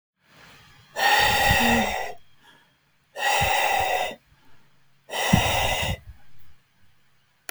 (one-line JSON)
{"exhalation_length": "7.5 s", "exhalation_amplitude": 22065, "exhalation_signal_mean_std_ratio": 0.57, "survey_phase": "alpha (2021-03-01 to 2021-08-12)", "age": "45-64", "gender": "Male", "wearing_mask": "No", "symptom_none": true, "smoker_status": "Never smoked", "respiratory_condition_asthma": false, "respiratory_condition_other": false, "recruitment_source": "REACT", "submission_delay": "10 days", "covid_test_result": "Negative", "covid_test_method": "RT-qPCR"}